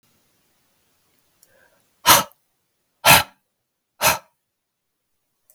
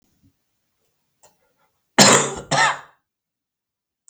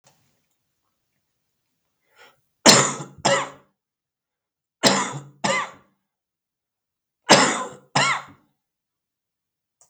{"exhalation_length": "5.5 s", "exhalation_amplitude": 32768, "exhalation_signal_mean_std_ratio": 0.22, "cough_length": "4.1 s", "cough_amplitude": 32768, "cough_signal_mean_std_ratio": 0.28, "three_cough_length": "9.9 s", "three_cough_amplitude": 32768, "three_cough_signal_mean_std_ratio": 0.29, "survey_phase": "beta (2021-08-13 to 2022-03-07)", "age": "45-64", "gender": "Male", "wearing_mask": "No", "symptom_cough_any": true, "symptom_runny_or_blocked_nose": true, "symptom_sore_throat": true, "symptom_fatigue": true, "symptom_headache": true, "symptom_onset": "8 days", "smoker_status": "Never smoked", "respiratory_condition_asthma": false, "respiratory_condition_other": false, "recruitment_source": "Test and Trace", "submission_delay": "2 days", "covid_test_method": "RT-qPCR", "covid_ct_value": 37.2, "covid_ct_gene": "ORF1ab gene"}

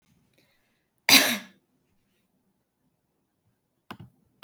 {"cough_length": "4.4 s", "cough_amplitude": 26869, "cough_signal_mean_std_ratio": 0.19, "survey_phase": "beta (2021-08-13 to 2022-03-07)", "age": "18-44", "gender": "Female", "wearing_mask": "No", "symptom_none": true, "symptom_onset": "12 days", "smoker_status": "Never smoked", "respiratory_condition_asthma": false, "respiratory_condition_other": false, "recruitment_source": "REACT", "submission_delay": "10 days", "covid_test_result": "Negative", "covid_test_method": "RT-qPCR", "influenza_a_test_result": "Negative", "influenza_b_test_result": "Negative"}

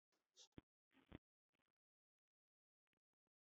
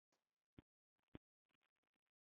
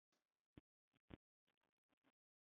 {"three_cough_length": "3.4 s", "three_cough_amplitude": 289, "three_cough_signal_mean_std_ratio": 0.15, "cough_length": "2.3 s", "cough_amplitude": 308, "cough_signal_mean_std_ratio": 0.09, "exhalation_length": "2.5 s", "exhalation_amplitude": 304, "exhalation_signal_mean_std_ratio": 0.12, "survey_phase": "beta (2021-08-13 to 2022-03-07)", "age": "45-64", "gender": "Male", "wearing_mask": "No", "symptom_none": true, "smoker_status": "Ex-smoker", "respiratory_condition_asthma": false, "respiratory_condition_other": false, "recruitment_source": "REACT", "submission_delay": "8 days", "covid_test_result": "Negative", "covid_test_method": "RT-qPCR", "influenza_a_test_result": "Negative", "influenza_b_test_result": "Negative"}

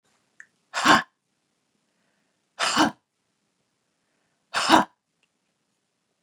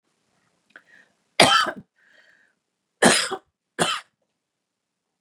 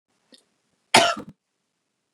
{"exhalation_length": "6.2 s", "exhalation_amplitude": 29108, "exhalation_signal_mean_std_ratio": 0.26, "three_cough_length": "5.2 s", "three_cough_amplitude": 32480, "three_cough_signal_mean_std_ratio": 0.28, "cough_length": "2.1 s", "cough_amplitude": 32676, "cough_signal_mean_std_ratio": 0.23, "survey_phase": "beta (2021-08-13 to 2022-03-07)", "age": "45-64", "gender": "Female", "wearing_mask": "No", "symptom_none": true, "smoker_status": "Never smoked", "respiratory_condition_asthma": true, "respiratory_condition_other": false, "recruitment_source": "Test and Trace", "submission_delay": "2 days", "covid_test_result": "Negative", "covid_test_method": "RT-qPCR"}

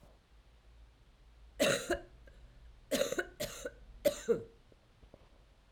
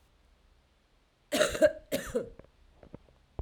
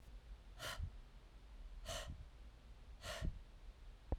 {"three_cough_length": "5.7 s", "three_cough_amplitude": 4800, "three_cough_signal_mean_std_ratio": 0.39, "cough_length": "3.4 s", "cough_amplitude": 9176, "cough_signal_mean_std_ratio": 0.32, "exhalation_length": "4.2 s", "exhalation_amplitude": 1743, "exhalation_signal_mean_std_ratio": 0.75, "survey_phase": "alpha (2021-03-01 to 2021-08-12)", "age": "45-64", "gender": "Female", "wearing_mask": "No", "symptom_cough_any": true, "symptom_diarrhoea": true, "symptom_fatigue": true, "symptom_headache": true, "symptom_change_to_sense_of_smell_or_taste": true, "symptom_loss_of_taste": true, "symptom_onset": "4 days", "smoker_status": "Ex-smoker", "respiratory_condition_asthma": false, "respiratory_condition_other": false, "recruitment_source": "Test and Trace", "submission_delay": "2 days", "covid_test_result": "Positive", "covid_test_method": "RT-qPCR"}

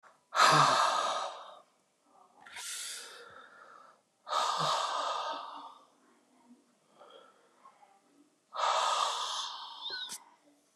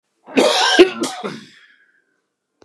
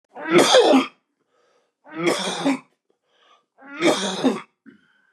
{"exhalation_length": "10.8 s", "exhalation_amplitude": 9150, "exhalation_signal_mean_std_ratio": 0.48, "cough_length": "2.6 s", "cough_amplitude": 32768, "cough_signal_mean_std_ratio": 0.41, "three_cough_length": "5.1 s", "three_cough_amplitude": 28600, "three_cough_signal_mean_std_ratio": 0.46, "survey_phase": "beta (2021-08-13 to 2022-03-07)", "age": "65+", "gender": "Male", "wearing_mask": "No", "symptom_none": true, "smoker_status": "Ex-smoker", "respiratory_condition_asthma": false, "respiratory_condition_other": false, "recruitment_source": "REACT", "submission_delay": "2 days", "covid_test_result": "Negative", "covid_test_method": "RT-qPCR", "influenza_a_test_result": "Negative", "influenza_b_test_result": "Negative"}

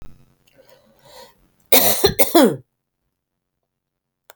{"cough_length": "4.4 s", "cough_amplitude": 32768, "cough_signal_mean_std_ratio": 0.31, "survey_phase": "beta (2021-08-13 to 2022-03-07)", "age": "45-64", "gender": "Female", "wearing_mask": "No", "symptom_runny_or_blocked_nose": true, "symptom_shortness_of_breath": true, "symptom_fatigue": true, "symptom_onset": "12 days", "smoker_status": "Never smoked", "respiratory_condition_asthma": false, "respiratory_condition_other": false, "recruitment_source": "REACT", "submission_delay": "2 days", "covid_test_result": "Negative", "covid_test_method": "RT-qPCR", "covid_ct_value": 38.8, "covid_ct_gene": "E gene", "influenza_a_test_result": "Negative", "influenza_b_test_result": "Negative"}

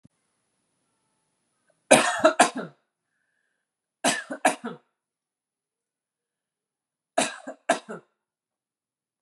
{"three_cough_length": "9.2 s", "three_cough_amplitude": 28903, "three_cough_signal_mean_std_ratio": 0.24, "survey_phase": "beta (2021-08-13 to 2022-03-07)", "age": "18-44", "gender": "Female", "wearing_mask": "No", "symptom_sore_throat": true, "symptom_abdominal_pain": true, "symptom_fatigue": true, "symptom_headache": true, "symptom_change_to_sense_of_smell_or_taste": true, "symptom_other": true, "symptom_onset": "3 days", "smoker_status": "Never smoked", "respiratory_condition_asthma": false, "respiratory_condition_other": false, "recruitment_source": "Test and Trace", "submission_delay": "2 days", "covid_test_result": "Negative", "covid_test_method": "RT-qPCR"}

